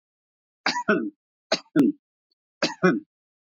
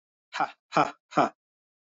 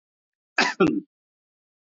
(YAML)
three_cough_length: 3.6 s
three_cough_amplitude: 14136
three_cough_signal_mean_std_ratio: 0.38
exhalation_length: 1.9 s
exhalation_amplitude: 12127
exhalation_signal_mean_std_ratio: 0.33
cough_length: 1.9 s
cough_amplitude: 15227
cough_signal_mean_std_ratio: 0.33
survey_phase: beta (2021-08-13 to 2022-03-07)
age: 45-64
gender: Male
wearing_mask: 'No'
symptom_none: true
smoker_status: Never smoked
respiratory_condition_asthma: false
respiratory_condition_other: false
recruitment_source: REACT
submission_delay: -2 days
covid_test_result: Negative
covid_test_method: RT-qPCR
influenza_a_test_result: Negative
influenza_b_test_result: Negative